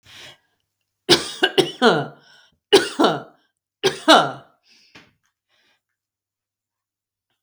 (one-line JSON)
{"three_cough_length": "7.4 s", "three_cough_amplitude": 32768, "three_cough_signal_mean_std_ratio": 0.3, "survey_phase": "beta (2021-08-13 to 2022-03-07)", "age": "45-64", "gender": "Female", "wearing_mask": "No", "symptom_none": true, "smoker_status": "Ex-smoker", "respiratory_condition_asthma": false, "respiratory_condition_other": false, "recruitment_source": "REACT", "submission_delay": "1 day", "covid_test_result": "Negative", "covid_test_method": "RT-qPCR"}